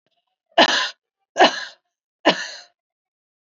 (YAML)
three_cough_length: 3.4 s
three_cough_amplitude: 27820
three_cough_signal_mean_std_ratio: 0.31
survey_phase: beta (2021-08-13 to 2022-03-07)
age: 18-44
gender: Female
wearing_mask: 'No'
symptom_cough_any: true
symptom_runny_or_blocked_nose: true
symptom_sore_throat: true
symptom_onset: 6 days
smoker_status: Never smoked
respiratory_condition_asthma: false
respiratory_condition_other: false
recruitment_source: Test and Trace
submission_delay: 2 days
covid_test_result: Positive
covid_test_method: RT-qPCR
covid_ct_value: 25.0
covid_ct_gene: N gene